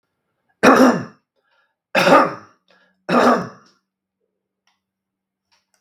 three_cough_length: 5.8 s
three_cough_amplitude: 32768
three_cough_signal_mean_std_ratio: 0.34
survey_phase: beta (2021-08-13 to 2022-03-07)
age: 65+
gender: Male
wearing_mask: 'No'
symptom_none: true
smoker_status: Ex-smoker
respiratory_condition_asthma: false
respiratory_condition_other: false
recruitment_source: REACT
submission_delay: 0 days
covid_test_result: Negative
covid_test_method: RT-qPCR
influenza_a_test_result: Unknown/Void
influenza_b_test_result: Unknown/Void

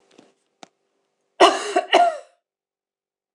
cough_length: 3.3 s
cough_amplitude: 26028
cough_signal_mean_std_ratio: 0.3
survey_phase: beta (2021-08-13 to 2022-03-07)
age: 45-64
gender: Female
wearing_mask: 'No'
symptom_cough_any: true
symptom_runny_or_blocked_nose: true
symptom_shortness_of_breath: true
symptom_sore_throat: true
symptom_fatigue: true
symptom_onset: 2 days
smoker_status: Ex-smoker
respiratory_condition_asthma: false
respiratory_condition_other: false
recruitment_source: Test and Trace
submission_delay: 2 days
covid_test_result: Positive
covid_test_method: RT-qPCR
covid_ct_value: 17.6
covid_ct_gene: ORF1ab gene
covid_ct_mean: 17.8
covid_viral_load: 1500000 copies/ml
covid_viral_load_category: High viral load (>1M copies/ml)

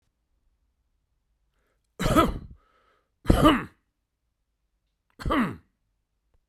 cough_length: 6.5 s
cough_amplitude: 28640
cough_signal_mean_std_ratio: 0.29
survey_phase: beta (2021-08-13 to 2022-03-07)
age: 65+
gender: Male
wearing_mask: 'No'
symptom_none: true
smoker_status: Never smoked
respiratory_condition_asthma: false
respiratory_condition_other: false
recruitment_source: REACT
submission_delay: 2 days
covid_test_result: Negative
covid_test_method: RT-qPCR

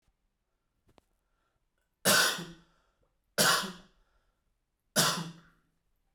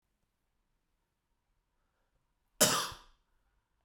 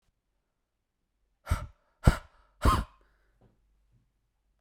three_cough_length: 6.1 s
three_cough_amplitude: 8711
three_cough_signal_mean_std_ratio: 0.31
cough_length: 3.8 s
cough_amplitude: 9362
cough_signal_mean_std_ratio: 0.2
exhalation_length: 4.6 s
exhalation_amplitude: 15064
exhalation_signal_mean_std_ratio: 0.21
survey_phase: beta (2021-08-13 to 2022-03-07)
age: 18-44
gender: Male
wearing_mask: 'No'
symptom_cough_any: true
symptom_new_continuous_cough: true
symptom_runny_or_blocked_nose: true
symptom_fatigue: true
symptom_fever_high_temperature: true
symptom_headache: true
smoker_status: Never smoked
respiratory_condition_asthma: false
respiratory_condition_other: false
recruitment_source: Test and Trace
submission_delay: 2 days
covid_test_result: Positive
covid_test_method: RT-qPCR
covid_ct_value: 16.1
covid_ct_gene: ORF1ab gene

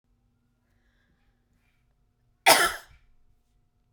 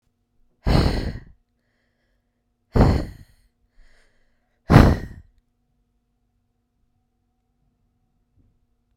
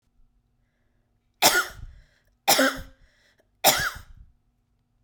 cough_length: 3.9 s
cough_amplitude: 23505
cough_signal_mean_std_ratio: 0.2
exhalation_length: 9.0 s
exhalation_amplitude: 32768
exhalation_signal_mean_std_ratio: 0.25
three_cough_length: 5.0 s
three_cough_amplitude: 29206
three_cough_signal_mean_std_ratio: 0.32
survey_phase: beta (2021-08-13 to 2022-03-07)
age: 18-44
gender: Female
wearing_mask: 'No'
symptom_cough_any: true
symptom_fatigue: true
symptom_onset: 11 days
smoker_status: Never smoked
respiratory_condition_asthma: false
respiratory_condition_other: false
recruitment_source: REACT
submission_delay: 1 day
covid_test_result: Negative
covid_test_method: RT-qPCR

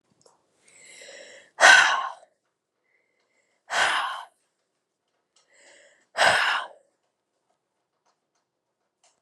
exhalation_length: 9.2 s
exhalation_amplitude: 28571
exhalation_signal_mean_std_ratio: 0.28
survey_phase: beta (2021-08-13 to 2022-03-07)
age: 18-44
gender: Female
wearing_mask: 'No'
symptom_cough_any: true
symptom_runny_or_blocked_nose: true
symptom_abdominal_pain: true
symptom_diarrhoea: true
symptom_headache: true
symptom_change_to_sense_of_smell_or_taste: true
symptom_onset: 3 days
smoker_status: Ex-smoker
respiratory_condition_asthma: true
respiratory_condition_other: false
recruitment_source: Test and Trace
submission_delay: 2 days
covid_test_result: Positive
covid_test_method: RT-qPCR
covid_ct_value: 21.3
covid_ct_gene: ORF1ab gene
covid_ct_mean: 21.5
covid_viral_load: 88000 copies/ml
covid_viral_load_category: Low viral load (10K-1M copies/ml)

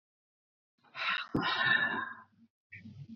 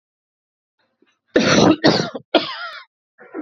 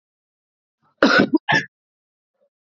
exhalation_length: 3.2 s
exhalation_amplitude: 4987
exhalation_signal_mean_std_ratio: 0.51
three_cough_length: 3.4 s
three_cough_amplitude: 30072
three_cough_signal_mean_std_ratio: 0.41
cough_length: 2.7 s
cough_amplitude: 31950
cough_signal_mean_std_ratio: 0.31
survey_phase: beta (2021-08-13 to 2022-03-07)
age: 18-44
gender: Female
wearing_mask: 'No'
symptom_shortness_of_breath: true
smoker_status: Current smoker (e-cigarettes or vapes only)
respiratory_condition_asthma: true
respiratory_condition_other: true
recruitment_source: REACT
submission_delay: 2 days
covid_test_result: Negative
covid_test_method: RT-qPCR
influenza_a_test_result: Negative
influenza_b_test_result: Negative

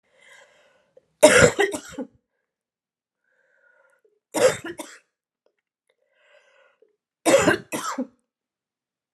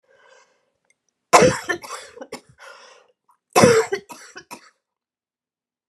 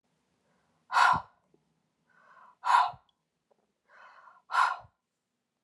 three_cough_length: 9.1 s
three_cough_amplitude: 32436
three_cough_signal_mean_std_ratio: 0.27
cough_length: 5.9 s
cough_amplitude: 32768
cough_signal_mean_std_ratio: 0.28
exhalation_length: 5.6 s
exhalation_amplitude: 10904
exhalation_signal_mean_std_ratio: 0.3
survey_phase: alpha (2021-03-01 to 2021-08-12)
age: 45-64
gender: Female
wearing_mask: 'No'
symptom_cough_any: true
symptom_fatigue: true
symptom_fever_high_temperature: true
symptom_headache: true
symptom_onset: 5 days
smoker_status: Ex-smoker
respiratory_condition_asthma: false
respiratory_condition_other: false
recruitment_source: Test and Trace
submission_delay: 2 days
covid_test_result: Positive
covid_test_method: RT-qPCR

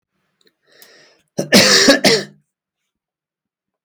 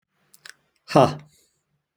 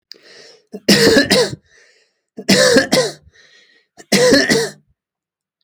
cough_length: 3.8 s
cough_amplitude: 32768
cough_signal_mean_std_ratio: 0.35
exhalation_length: 2.0 s
exhalation_amplitude: 30680
exhalation_signal_mean_std_ratio: 0.23
three_cough_length: 5.6 s
three_cough_amplitude: 32767
three_cough_signal_mean_std_ratio: 0.48
survey_phase: alpha (2021-03-01 to 2021-08-12)
age: 18-44
gender: Male
wearing_mask: 'No'
symptom_none: true
smoker_status: Never smoked
respiratory_condition_asthma: false
respiratory_condition_other: false
recruitment_source: REACT
submission_delay: 2 days
covid_test_result: Negative
covid_test_method: RT-qPCR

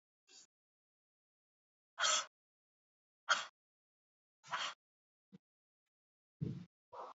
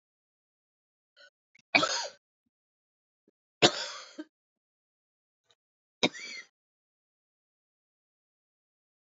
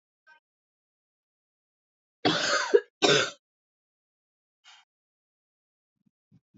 exhalation_length: 7.2 s
exhalation_amplitude: 4134
exhalation_signal_mean_std_ratio: 0.25
three_cough_length: 9.0 s
three_cough_amplitude: 15211
three_cough_signal_mean_std_ratio: 0.18
cough_length: 6.6 s
cough_amplitude: 15746
cough_signal_mean_std_ratio: 0.25
survey_phase: beta (2021-08-13 to 2022-03-07)
age: 18-44
gender: Female
wearing_mask: 'No'
symptom_new_continuous_cough: true
symptom_sore_throat: true
symptom_fatigue: true
symptom_headache: true
symptom_onset: 3 days
smoker_status: Never smoked
respiratory_condition_asthma: false
respiratory_condition_other: false
recruitment_source: Test and Trace
submission_delay: 1 day
covid_test_result: Positive
covid_test_method: RT-qPCR
covid_ct_value: 17.7
covid_ct_gene: ORF1ab gene
covid_ct_mean: 18.3
covid_viral_load: 980000 copies/ml
covid_viral_load_category: Low viral load (10K-1M copies/ml)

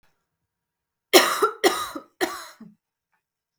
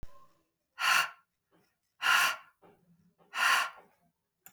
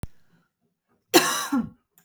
three_cough_length: 3.6 s
three_cough_amplitude: 32672
three_cough_signal_mean_std_ratio: 0.31
exhalation_length: 4.5 s
exhalation_amplitude: 7572
exhalation_signal_mean_std_ratio: 0.39
cough_length: 2.0 s
cough_amplitude: 24521
cough_signal_mean_std_ratio: 0.36
survey_phase: beta (2021-08-13 to 2022-03-07)
age: 18-44
gender: Female
wearing_mask: 'No'
symptom_cough_any: true
symptom_runny_or_blocked_nose: true
smoker_status: Never smoked
respiratory_condition_asthma: false
respiratory_condition_other: false
recruitment_source: Test and Trace
submission_delay: 2 days
covid_test_result: Positive
covid_test_method: RT-qPCR
covid_ct_value: 28.0
covid_ct_gene: ORF1ab gene
covid_ct_mean: 28.7
covid_viral_load: 380 copies/ml
covid_viral_load_category: Minimal viral load (< 10K copies/ml)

